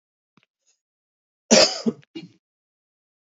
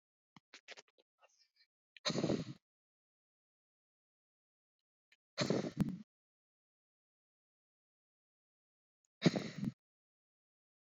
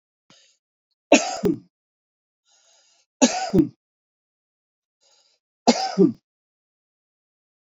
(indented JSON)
{
  "cough_length": "3.3 s",
  "cough_amplitude": 30507,
  "cough_signal_mean_std_ratio": 0.23,
  "exhalation_length": "10.8 s",
  "exhalation_amplitude": 5168,
  "exhalation_signal_mean_std_ratio": 0.24,
  "three_cough_length": "7.7 s",
  "three_cough_amplitude": 28446,
  "three_cough_signal_mean_std_ratio": 0.26,
  "survey_phase": "beta (2021-08-13 to 2022-03-07)",
  "age": "18-44",
  "gender": "Male",
  "wearing_mask": "No",
  "symptom_fatigue": true,
  "smoker_status": "Current smoker (11 or more cigarettes per day)",
  "respiratory_condition_asthma": false,
  "respiratory_condition_other": false,
  "recruitment_source": "REACT",
  "submission_delay": "1 day",
  "covid_test_result": "Negative",
  "covid_test_method": "RT-qPCR"
}